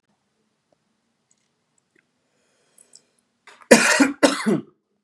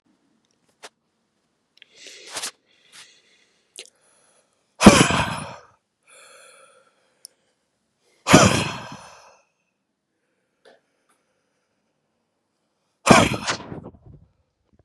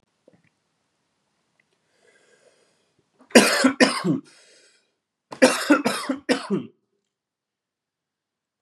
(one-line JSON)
{"cough_length": "5.0 s", "cough_amplitude": 32768, "cough_signal_mean_std_ratio": 0.27, "exhalation_length": "14.8 s", "exhalation_amplitude": 32768, "exhalation_signal_mean_std_ratio": 0.22, "three_cough_length": "8.6 s", "three_cough_amplitude": 31707, "three_cough_signal_mean_std_ratio": 0.3, "survey_phase": "beta (2021-08-13 to 2022-03-07)", "age": "18-44", "gender": "Male", "wearing_mask": "No", "symptom_cough_any": true, "symptom_new_continuous_cough": true, "symptom_runny_or_blocked_nose": true, "symptom_onset": "3 days", "smoker_status": "Never smoked", "respiratory_condition_asthma": false, "respiratory_condition_other": false, "recruitment_source": "Test and Trace", "submission_delay": "2 days", "covid_test_result": "Positive", "covid_test_method": "RT-qPCR", "covid_ct_value": 23.9, "covid_ct_gene": "N gene"}